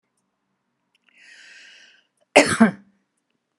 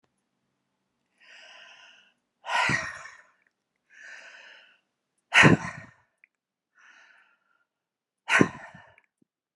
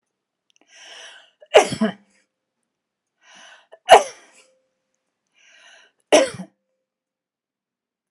{"cough_length": "3.6 s", "cough_amplitude": 32332, "cough_signal_mean_std_ratio": 0.22, "exhalation_length": "9.6 s", "exhalation_amplitude": 24754, "exhalation_signal_mean_std_ratio": 0.23, "three_cough_length": "8.1 s", "three_cough_amplitude": 32768, "three_cough_signal_mean_std_ratio": 0.2, "survey_phase": "beta (2021-08-13 to 2022-03-07)", "age": "45-64", "gender": "Female", "wearing_mask": "No", "symptom_none": true, "smoker_status": "Ex-smoker", "respiratory_condition_asthma": false, "respiratory_condition_other": false, "recruitment_source": "REACT", "submission_delay": "2 days", "covid_test_result": "Negative", "covid_test_method": "RT-qPCR", "influenza_a_test_result": "Negative", "influenza_b_test_result": "Negative"}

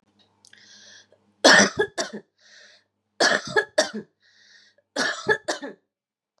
{"three_cough_length": "6.4 s", "three_cough_amplitude": 29552, "three_cough_signal_mean_std_ratio": 0.33, "survey_phase": "beta (2021-08-13 to 2022-03-07)", "age": "18-44", "gender": "Female", "wearing_mask": "No", "symptom_none": true, "smoker_status": "Never smoked", "respiratory_condition_asthma": true, "respiratory_condition_other": false, "recruitment_source": "REACT", "submission_delay": "1 day", "covid_test_result": "Negative", "covid_test_method": "RT-qPCR", "influenza_a_test_result": "Unknown/Void", "influenza_b_test_result": "Unknown/Void"}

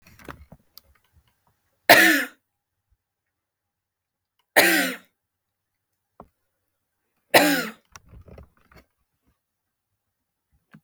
{"three_cough_length": "10.8 s", "three_cough_amplitude": 32768, "three_cough_signal_mean_std_ratio": 0.23, "survey_phase": "beta (2021-08-13 to 2022-03-07)", "age": "45-64", "gender": "Female", "wearing_mask": "No", "symptom_cough_any": true, "symptom_shortness_of_breath": true, "symptom_fatigue": true, "smoker_status": "Never smoked", "respiratory_condition_asthma": true, "respiratory_condition_other": false, "recruitment_source": "REACT", "submission_delay": "2 days", "covid_test_result": "Negative", "covid_test_method": "RT-qPCR", "influenza_a_test_result": "Negative", "influenza_b_test_result": "Negative"}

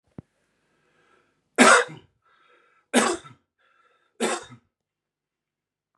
{"three_cough_length": "6.0 s", "three_cough_amplitude": 31513, "three_cough_signal_mean_std_ratio": 0.25, "survey_phase": "beta (2021-08-13 to 2022-03-07)", "age": "18-44", "gender": "Male", "wearing_mask": "No", "symptom_none": true, "smoker_status": "Ex-smoker", "respiratory_condition_asthma": true, "respiratory_condition_other": false, "recruitment_source": "REACT", "submission_delay": "1 day", "covid_test_result": "Negative", "covid_test_method": "RT-qPCR", "influenza_a_test_result": "Negative", "influenza_b_test_result": "Negative"}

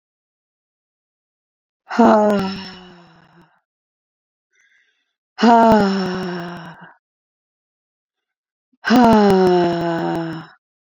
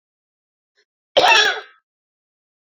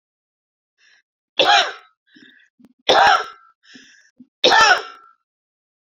{"exhalation_length": "10.9 s", "exhalation_amplitude": 28281, "exhalation_signal_mean_std_ratio": 0.42, "cough_length": "2.6 s", "cough_amplitude": 27579, "cough_signal_mean_std_ratio": 0.32, "three_cough_length": "5.8 s", "three_cough_amplitude": 32767, "three_cough_signal_mean_std_ratio": 0.35, "survey_phase": "beta (2021-08-13 to 2022-03-07)", "age": "18-44", "gender": "Female", "wearing_mask": "No", "symptom_none": true, "smoker_status": "Ex-smoker", "respiratory_condition_asthma": false, "respiratory_condition_other": false, "recruitment_source": "REACT", "submission_delay": "3 days", "covid_test_result": "Negative", "covid_test_method": "RT-qPCR"}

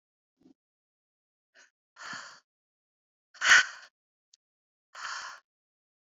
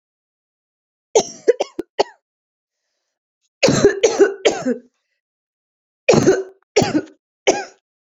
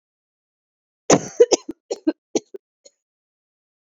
{"exhalation_length": "6.1 s", "exhalation_amplitude": 15997, "exhalation_signal_mean_std_ratio": 0.19, "three_cough_length": "8.2 s", "three_cough_amplitude": 32768, "three_cough_signal_mean_std_ratio": 0.36, "cough_length": "3.8 s", "cough_amplitude": 29934, "cough_signal_mean_std_ratio": 0.22, "survey_phase": "beta (2021-08-13 to 2022-03-07)", "age": "18-44", "gender": "Female", "wearing_mask": "No", "symptom_cough_any": true, "symptom_runny_or_blocked_nose": true, "symptom_shortness_of_breath": true, "symptom_abdominal_pain": true, "symptom_fatigue": true, "symptom_fever_high_temperature": true, "symptom_headache": true, "symptom_change_to_sense_of_smell_or_taste": true, "symptom_loss_of_taste": true, "smoker_status": "Never smoked", "respiratory_condition_asthma": false, "respiratory_condition_other": true, "recruitment_source": "Test and Trace", "submission_delay": "2 days", "covid_test_result": "Positive", "covid_test_method": "RT-qPCR"}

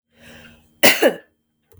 {"cough_length": "1.8 s", "cough_amplitude": 32768, "cough_signal_mean_std_ratio": 0.31, "survey_phase": "beta (2021-08-13 to 2022-03-07)", "age": "45-64", "gender": "Female", "wearing_mask": "No", "symptom_sore_throat": true, "symptom_onset": "3 days", "smoker_status": "Never smoked", "respiratory_condition_asthma": false, "respiratory_condition_other": false, "recruitment_source": "REACT", "submission_delay": "2 days", "covid_test_result": "Negative", "covid_test_method": "RT-qPCR", "influenza_a_test_result": "Negative", "influenza_b_test_result": "Negative"}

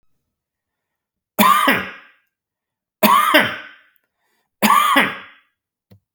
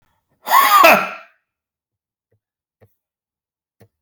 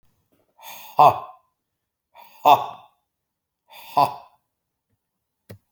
{"three_cough_length": "6.1 s", "three_cough_amplitude": 32768, "three_cough_signal_mean_std_ratio": 0.4, "cough_length": "4.0 s", "cough_amplitude": 31837, "cough_signal_mean_std_ratio": 0.31, "exhalation_length": "5.7 s", "exhalation_amplitude": 28145, "exhalation_signal_mean_std_ratio": 0.23, "survey_phase": "beta (2021-08-13 to 2022-03-07)", "age": "45-64", "gender": "Male", "wearing_mask": "No", "symptom_none": true, "smoker_status": "Never smoked", "respiratory_condition_asthma": false, "respiratory_condition_other": false, "recruitment_source": "REACT", "submission_delay": "1 day", "covid_test_result": "Negative", "covid_test_method": "RT-qPCR"}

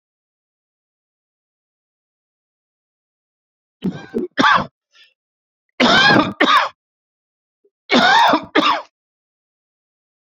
{"three_cough_length": "10.2 s", "three_cough_amplitude": 31357, "three_cough_signal_mean_std_ratio": 0.35, "survey_phase": "beta (2021-08-13 to 2022-03-07)", "age": "45-64", "gender": "Male", "wearing_mask": "No", "symptom_none": true, "smoker_status": "Ex-smoker", "respiratory_condition_asthma": false, "respiratory_condition_other": false, "recruitment_source": "REACT", "submission_delay": "5 days", "covid_test_result": "Negative", "covid_test_method": "RT-qPCR"}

